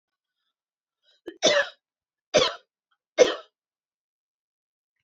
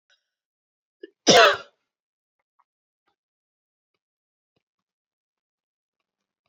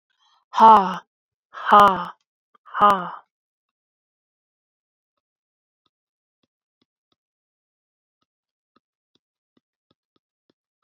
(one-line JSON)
{"three_cough_length": "5.0 s", "three_cough_amplitude": 21938, "three_cough_signal_mean_std_ratio": 0.25, "cough_length": "6.5 s", "cough_amplitude": 27402, "cough_signal_mean_std_ratio": 0.16, "exhalation_length": "10.8 s", "exhalation_amplitude": 27877, "exhalation_signal_mean_std_ratio": 0.21, "survey_phase": "alpha (2021-03-01 to 2021-08-12)", "age": "18-44", "gender": "Female", "wearing_mask": "No", "symptom_none": true, "smoker_status": "Ex-smoker", "respiratory_condition_asthma": false, "respiratory_condition_other": false, "recruitment_source": "REACT", "submission_delay": "1 day", "covid_test_result": "Negative", "covid_test_method": "RT-qPCR"}